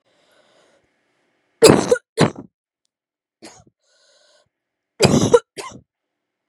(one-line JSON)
{"cough_length": "6.5 s", "cough_amplitude": 32768, "cough_signal_mean_std_ratio": 0.26, "survey_phase": "beta (2021-08-13 to 2022-03-07)", "age": "18-44", "gender": "Female", "wearing_mask": "No", "symptom_cough_any": true, "symptom_runny_or_blocked_nose": true, "symptom_shortness_of_breath": true, "symptom_sore_throat": true, "symptom_abdominal_pain": true, "symptom_diarrhoea": true, "symptom_fatigue": true, "symptom_headache": true, "smoker_status": "Never smoked", "respiratory_condition_asthma": true, "respiratory_condition_other": false, "recruitment_source": "Test and Trace", "submission_delay": "2 days", "covid_test_result": "Positive", "covid_test_method": "RT-qPCR", "covid_ct_value": 25.7, "covid_ct_gene": "N gene"}